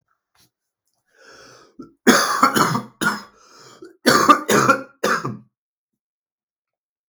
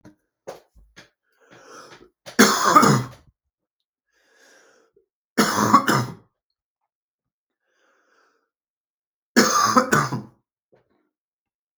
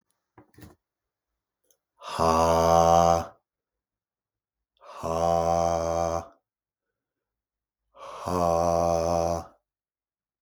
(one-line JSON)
{"cough_length": "7.1 s", "cough_amplitude": 32475, "cough_signal_mean_std_ratio": 0.38, "three_cough_length": "11.8 s", "three_cough_amplitude": 32475, "three_cough_signal_mean_std_ratio": 0.32, "exhalation_length": "10.4 s", "exhalation_amplitude": 18078, "exhalation_signal_mean_std_ratio": 0.44, "survey_phase": "beta (2021-08-13 to 2022-03-07)", "age": "18-44", "gender": "Male", "wearing_mask": "No", "symptom_cough_any": true, "symptom_runny_or_blocked_nose": true, "symptom_shortness_of_breath": true, "symptom_sore_throat": true, "symptom_fever_high_temperature": true, "symptom_other": true, "symptom_onset": "2 days", "smoker_status": "Never smoked", "respiratory_condition_asthma": false, "respiratory_condition_other": false, "recruitment_source": "Test and Trace", "submission_delay": "2 days", "covid_test_result": "Positive", "covid_test_method": "RT-qPCR", "covid_ct_value": 35.3, "covid_ct_gene": "ORF1ab gene"}